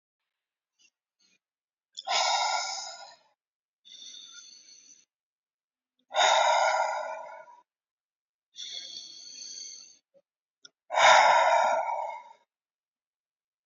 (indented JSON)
{
  "exhalation_length": "13.7 s",
  "exhalation_amplitude": 15071,
  "exhalation_signal_mean_std_ratio": 0.39,
  "survey_phase": "beta (2021-08-13 to 2022-03-07)",
  "age": "18-44",
  "gender": "Male",
  "wearing_mask": "No",
  "symptom_none": true,
  "smoker_status": "Never smoked",
  "respiratory_condition_asthma": false,
  "respiratory_condition_other": false,
  "recruitment_source": "REACT",
  "submission_delay": "3 days",
  "covid_test_result": "Negative",
  "covid_test_method": "RT-qPCR",
  "influenza_a_test_result": "Negative",
  "influenza_b_test_result": "Negative"
}